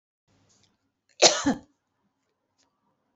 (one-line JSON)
{"cough_length": "3.2 s", "cough_amplitude": 28010, "cough_signal_mean_std_ratio": 0.21, "survey_phase": "beta (2021-08-13 to 2022-03-07)", "age": "45-64", "gender": "Female", "wearing_mask": "No", "symptom_none": true, "smoker_status": "Never smoked", "respiratory_condition_asthma": false, "respiratory_condition_other": false, "recruitment_source": "Test and Trace", "submission_delay": "0 days", "covid_test_result": "Negative", "covid_test_method": "LFT"}